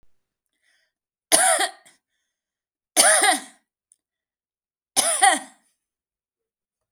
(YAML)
three_cough_length: 6.9 s
three_cough_amplitude: 32768
three_cough_signal_mean_std_ratio: 0.32
survey_phase: beta (2021-08-13 to 2022-03-07)
age: 45-64
gender: Female
wearing_mask: 'No'
symptom_none: true
smoker_status: Ex-smoker
respiratory_condition_asthma: false
respiratory_condition_other: false
recruitment_source: REACT
submission_delay: 5 days
covid_test_result: Negative
covid_test_method: RT-qPCR